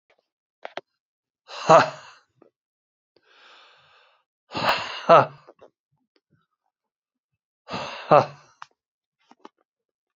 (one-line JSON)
{"exhalation_length": "10.2 s", "exhalation_amplitude": 31536, "exhalation_signal_mean_std_ratio": 0.22, "survey_phase": "beta (2021-08-13 to 2022-03-07)", "age": "45-64", "gender": "Male", "wearing_mask": "No", "symptom_cough_any": true, "symptom_runny_or_blocked_nose": true, "symptom_sore_throat": true, "symptom_fatigue": true, "symptom_other": true, "symptom_onset": "3 days", "smoker_status": "Ex-smoker", "respiratory_condition_asthma": false, "respiratory_condition_other": true, "recruitment_source": "Test and Trace", "submission_delay": "2 days", "covid_test_result": "Positive", "covid_test_method": "RT-qPCR"}